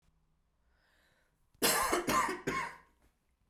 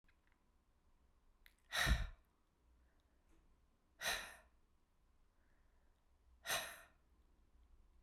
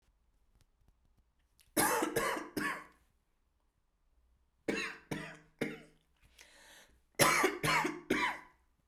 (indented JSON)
{
  "cough_length": "3.5 s",
  "cough_amplitude": 6018,
  "cough_signal_mean_std_ratio": 0.44,
  "exhalation_length": "8.0 s",
  "exhalation_amplitude": 1999,
  "exhalation_signal_mean_std_ratio": 0.29,
  "three_cough_length": "8.9 s",
  "three_cough_amplitude": 8989,
  "three_cough_signal_mean_std_ratio": 0.41,
  "survey_phase": "beta (2021-08-13 to 2022-03-07)",
  "age": "45-64",
  "gender": "Female",
  "wearing_mask": "No",
  "symptom_runny_or_blocked_nose": true,
  "smoker_status": "Ex-smoker",
  "respiratory_condition_asthma": false,
  "respiratory_condition_other": false,
  "recruitment_source": "REACT",
  "submission_delay": "2 days",
  "covid_test_result": "Negative",
  "covid_test_method": "RT-qPCR",
  "influenza_a_test_result": "Unknown/Void",
  "influenza_b_test_result": "Unknown/Void"
}